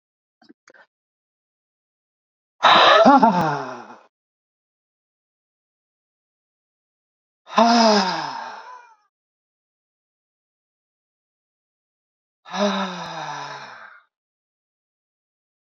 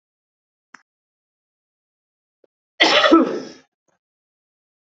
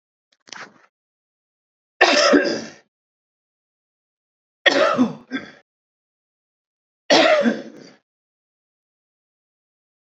{"exhalation_length": "15.6 s", "exhalation_amplitude": 27620, "exhalation_signal_mean_std_ratio": 0.3, "cough_length": "4.9 s", "cough_amplitude": 29821, "cough_signal_mean_std_ratio": 0.26, "three_cough_length": "10.2 s", "three_cough_amplitude": 30323, "three_cough_signal_mean_std_ratio": 0.32, "survey_phase": "beta (2021-08-13 to 2022-03-07)", "age": "45-64", "gender": "Male", "wearing_mask": "No", "symptom_cough_any": true, "symptom_runny_or_blocked_nose": true, "symptom_onset": "6 days", "smoker_status": "Never smoked", "respiratory_condition_asthma": true, "respiratory_condition_other": false, "recruitment_source": "REACT", "submission_delay": "2 days", "covid_test_result": "Negative", "covid_test_method": "RT-qPCR", "influenza_a_test_result": "Negative", "influenza_b_test_result": "Negative"}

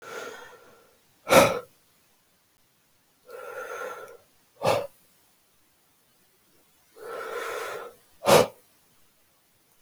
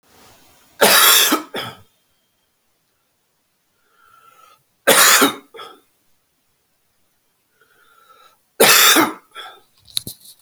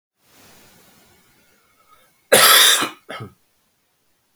{"exhalation_length": "9.8 s", "exhalation_amplitude": 22464, "exhalation_signal_mean_std_ratio": 0.28, "three_cough_length": "10.4 s", "three_cough_amplitude": 32768, "three_cough_signal_mean_std_ratio": 0.33, "cough_length": "4.4 s", "cough_amplitude": 32768, "cough_signal_mean_std_ratio": 0.3, "survey_phase": "beta (2021-08-13 to 2022-03-07)", "age": "45-64", "gender": "Male", "wearing_mask": "No", "symptom_cough_any": true, "symptom_runny_or_blocked_nose": true, "symptom_shortness_of_breath": true, "symptom_fatigue": true, "symptom_fever_high_temperature": true, "symptom_headache": true, "symptom_onset": "4 days", "smoker_status": "Ex-smoker", "respiratory_condition_asthma": false, "respiratory_condition_other": false, "recruitment_source": "Test and Trace", "submission_delay": "2 days", "covid_test_result": "Positive", "covid_test_method": "RT-qPCR", "covid_ct_value": 16.4, "covid_ct_gene": "ORF1ab gene", "covid_ct_mean": 17.0, "covid_viral_load": "2600000 copies/ml", "covid_viral_load_category": "High viral load (>1M copies/ml)"}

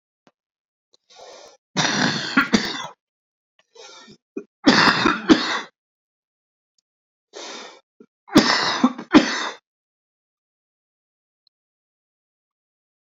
{"three_cough_length": "13.1 s", "three_cough_amplitude": 29046, "three_cough_signal_mean_std_ratio": 0.32, "survey_phase": "beta (2021-08-13 to 2022-03-07)", "age": "65+", "gender": "Male", "wearing_mask": "No", "symptom_cough_any": true, "symptom_runny_or_blocked_nose": true, "symptom_onset": "11 days", "smoker_status": "Ex-smoker", "respiratory_condition_asthma": true, "respiratory_condition_other": false, "recruitment_source": "REACT", "submission_delay": "2 days", "covid_test_result": "Positive", "covid_test_method": "RT-qPCR", "covid_ct_value": 26.6, "covid_ct_gene": "E gene", "influenza_a_test_result": "Negative", "influenza_b_test_result": "Negative"}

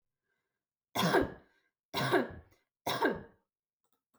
{"three_cough_length": "4.2 s", "three_cough_amplitude": 5948, "three_cough_signal_mean_std_ratio": 0.39, "survey_phase": "beta (2021-08-13 to 2022-03-07)", "age": "18-44", "gender": "Female", "wearing_mask": "No", "symptom_none": true, "smoker_status": "Never smoked", "respiratory_condition_asthma": false, "respiratory_condition_other": false, "recruitment_source": "REACT", "submission_delay": "1 day", "covid_test_result": "Negative", "covid_test_method": "RT-qPCR"}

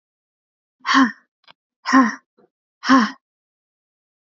{"exhalation_length": "4.4 s", "exhalation_amplitude": 28611, "exhalation_signal_mean_std_ratio": 0.31, "survey_phase": "alpha (2021-03-01 to 2021-08-12)", "age": "18-44", "gender": "Female", "wearing_mask": "No", "symptom_fatigue": true, "smoker_status": "Never smoked", "respiratory_condition_asthma": true, "respiratory_condition_other": false, "recruitment_source": "Test and Trace", "submission_delay": "2 days", "covid_test_result": "Positive", "covid_test_method": "RT-qPCR", "covid_ct_value": 23.5, "covid_ct_gene": "ORF1ab gene", "covid_ct_mean": 23.8, "covid_viral_load": "16000 copies/ml", "covid_viral_load_category": "Low viral load (10K-1M copies/ml)"}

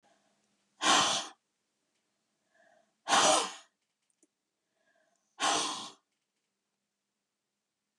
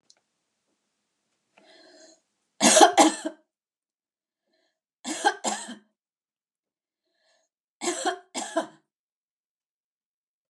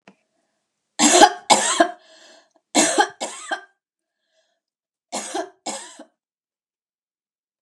{"exhalation_length": "8.0 s", "exhalation_amplitude": 8683, "exhalation_signal_mean_std_ratio": 0.31, "three_cough_length": "10.5 s", "three_cough_amplitude": 29982, "three_cough_signal_mean_std_ratio": 0.24, "cough_length": "7.6 s", "cough_amplitude": 32768, "cough_signal_mean_std_ratio": 0.31, "survey_phase": "beta (2021-08-13 to 2022-03-07)", "age": "65+", "gender": "Female", "wearing_mask": "No", "symptom_none": true, "smoker_status": "Never smoked", "respiratory_condition_asthma": false, "respiratory_condition_other": false, "recruitment_source": "REACT", "submission_delay": "2 days", "covid_test_result": "Negative", "covid_test_method": "RT-qPCR"}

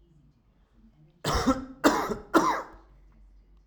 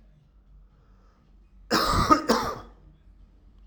{"three_cough_length": "3.7 s", "three_cough_amplitude": 17859, "three_cough_signal_mean_std_ratio": 0.42, "cough_length": "3.7 s", "cough_amplitude": 21317, "cough_signal_mean_std_ratio": 0.38, "survey_phase": "alpha (2021-03-01 to 2021-08-12)", "age": "18-44", "gender": "Male", "wearing_mask": "No", "symptom_none": true, "smoker_status": "Current smoker (e-cigarettes or vapes only)", "respiratory_condition_asthma": false, "respiratory_condition_other": false, "recruitment_source": "REACT", "submission_delay": "1 day", "covid_test_result": "Negative", "covid_test_method": "RT-qPCR"}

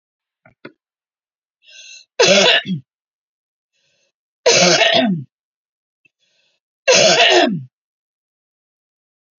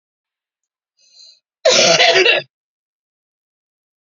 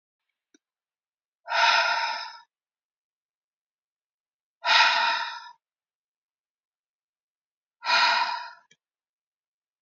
{"three_cough_length": "9.4 s", "three_cough_amplitude": 32768, "three_cough_signal_mean_std_ratio": 0.38, "cough_length": "4.0 s", "cough_amplitude": 30983, "cough_signal_mean_std_ratio": 0.36, "exhalation_length": "9.8 s", "exhalation_amplitude": 16086, "exhalation_signal_mean_std_ratio": 0.35, "survey_phase": "beta (2021-08-13 to 2022-03-07)", "age": "45-64", "gender": "Female", "wearing_mask": "No", "symptom_cough_any": true, "symptom_runny_or_blocked_nose": true, "symptom_sore_throat": true, "symptom_headache": true, "symptom_onset": "10 days", "smoker_status": "Ex-smoker", "respiratory_condition_asthma": false, "respiratory_condition_other": false, "recruitment_source": "REACT", "submission_delay": "2 days", "covid_test_result": "Negative", "covid_test_method": "RT-qPCR", "influenza_a_test_result": "Unknown/Void", "influenza_b_test_result": "Unknown/Void"}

